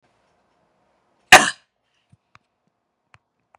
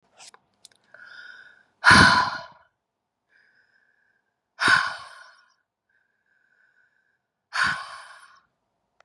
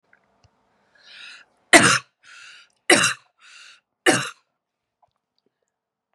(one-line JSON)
{"cough_length": "3.6 s", "cough_amplitude": 32768, "cough_signal_mean_std_ratio": 0.14, "exhalation_length": "9.0 s", "exhalation_amplitude": 29994, "exhalation_signal_mean_std_ratio": 0.26, "three_cough_length": "6.1 s", "three_cough_amplitude": 32768, "three_cough_signal_mean_std_ratio": 0.25, "survey_phase": "beta (2021-08-13 to 2022-03-07)", "age": "18-44", "gender": "Female", "wearing_mask": "No", "symptom_cough_any": true, "symptom_runny_or_blocked_nose": true, "symptom_onset": "5 days", "smoker_status": "Never smoked", "respiratory_condition_asthma": false, "respiratory_condition_other": false, "recruitment_source": "Test and Trace", "submission_delay": "2 days", "covid_test_result": "Positive", "covid_test_method": "RT-qPCR", "covid_ct_value": 27.0, "covid_ct_gene": "ORF1ab gene", "covid_ct_mean": 27.1, "covid_viral_load": "1300 copies/ml", "covid_viral_load_category": "Minimal viral load (< 10K copies/ml)"}